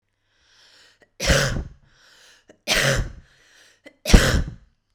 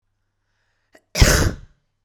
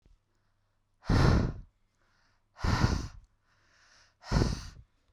{"three_cough_length": "4.9 s", "three_cough_amplitude": 32768, "three_cough_signal_mean_std_ratio": 0.36, "cough_length": "2.0 s", "cough_amplitude": 32768, "cough_signal_mean_std_ratio": 0.32, "exhalation_length": "5.1 s", "exhalation_amplitude": 10467, "exhalation_signal_mean_std_ratio": 0.39, "survey_phase": "beta (2021-08-13 to 2022-03-07)", "age": "18-44", "gender": "Female", "wearing_mask": "No", "symptom_none": true, "smoker_status": "Never smoked", "respiratory_condition_asthma": false, "respiratory_condition_other": false, "recruitment_source": "REACT", "submission_delay": "1 day", "covid_test_result": "Negative", "covid_test_method": "RT-qPCR", "influenza_a_test_result": "Negative", "influenza_b_test_result": "Negative"}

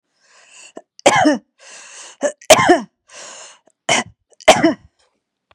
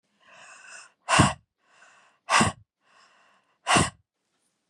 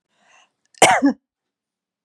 {"three_cough_length": "5.5 s", "three_cough_amplitude": 32768, "three_cough_signal_mean_std_ratio": 0.35, "exhalation_length": "4.7 s", "exhalation_amplitude": 23082, "exhalation_signal_mean_std_ratio": 0.31, "cough_length": "2.0 s", "cough_amplitude": 32768, "cough_signal_mean_std_ratio": 0.29, "survey_phase": "beta (2021-08-13 to 2022-03-07)", "age": "45-64", "gender": "Female", "wearing_mask": "No", "symptom_sore_throat": true, "symptom_headache": true, "symptom_onset": "12 days", "smoker_status": "Never smoked", "respiratory_condition_asthma": false, "respiratory_condition_other": false, "recruitment_source": "REACT", "submission_delay": "2 days", "covid_test_result": "Negative", "covid_test_method": "RT-qPCR", "influenza_a_test_result": "Negative", "influenza_b_test_result": "Negative"}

